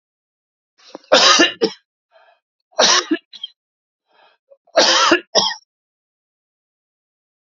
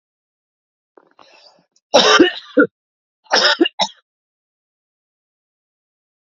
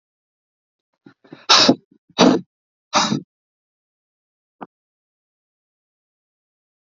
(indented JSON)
{
  "three_cough_length": "7.5 s",
  "three_cough_amplitude": 32768,
  "three_cough_signal_mean_std_ratio": 0.35,
  "cough_length": "6.3 s",
  "cough_amplitude": 32768,
  "cough_signal_mean_std_ratio": 0.29,
  "exhalation_length": "6.8 s",
  "exhalation_amplitude": 32768,
  "exhalation_signal_mean_std_ratio": 0.24,
  "survey_phase": "beta (2021-08-13 to 2022-03-07)",
  "age": "45-64",
  "gender": "Male",
  "wearing_mask": "No",
  "symptom_cough_any": true,
  "symptom_runny_or_blocked_nose": true,
  "symptom_shortness_of_breath": true,
  "symptom_sore_throat": true,
  "symptom_fatigue": true,
  "symptom_headache": true,
  "symptom_change_to_sense_of_smell_or_taste": true,
  "symptom_loss_of_taste": true,
  "smoker_status": "Never smoked",
  "respiratory_condition_asthma": false,
  "respiratory_condition_other": false,
  "recruitment_source": "Test and Trace",
  "submission_delay": "1 day",
  "covid_test_result": "Positive",
  "covid_test_method": "LFT"
}